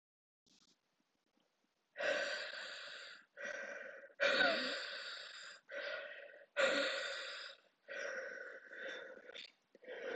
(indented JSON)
{
  "exhalation_length": "10.2 s",
  "exhalation_amplitude": 3192,
  "exhalation_signal_mean_std_ratio": 0.56,
  "survey_phase": "alpha (2021-03-01 to 2021-08-12)",
  "age": "18-44",
  "gender": "Female",
  "wearing_mask": "No",
  "symptom_cough_any": true,
  "symptom_new_continuous_cough": true,
  "symptom_shortness_of_breath": true,
  "symptom_fatigue": true,
  "symptom_fever_high_temperature": true,
  "symptom_headache": true,
  "symptom_change_to_sense_of_smell_or_taste": true,
  "symptom_loss_of_taste": true,
  "symptom_onset": "3 days",
  "smoker_status": "Never smoked",
  "respiratory_condition_asthma": true,
  "respiratory_condition_other": false,
  "recruitment_source": "Test and Trace",
  "submission_delay": "2 days",
  "covid_test_result": "Positive",
  "covid_test_method": "RT-qPCR"
}